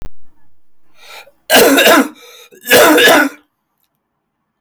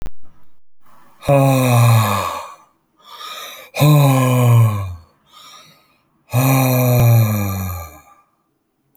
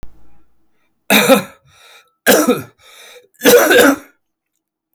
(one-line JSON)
{"cough_length": "4.6 s", "cough_amplitude": 32768, "cough_signal_mean_std_ratio": 0.51, "exhalation_length": "9.0 s", "exhalation_amplitude": 31003, "exhalation_signal_mean_std_ratio": 0.63, "three_cough_length": "4.9 s", "three_cough_amplitude": 32147, "three_cough_signal_mean_std_ratio": 0.43, "survey_phase": "alpha (2021-03-01 to 2021-08-12)", "age": "45-64", "gender": "Male", "wearing_mask": "No", "symptom_none": true, "smoker_status": "Never smoked", "respiratory_condition_asthma": false, "respiratory_condition_other": false, "recruitment_source": "REACT", "submission_delay": "4 days", "covid_test_result": "Negative", "covid_test_method": "RT-qPCR"}